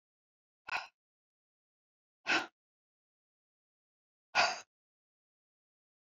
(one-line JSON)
{"exhalation_length": "6.1 s", "exhalation_amplitude": 6838, "exhalation_signal_mean_std_ratio": 0.21, "survey_phase": "beta (2021-08-13 to 2022-03-07)", "age": "65+", "gender": "Female", "wearing_mask": "No", "symptom_none": true, "smoker_status": "Never smoked", "respiratory_condition_asthma": false, "respiratory_condition_other": false, "recruitment_source": "REACT", "submission_delay": "1 day", "covid_test_result": "Negative", "covid_test_method": "RT-qPCR"}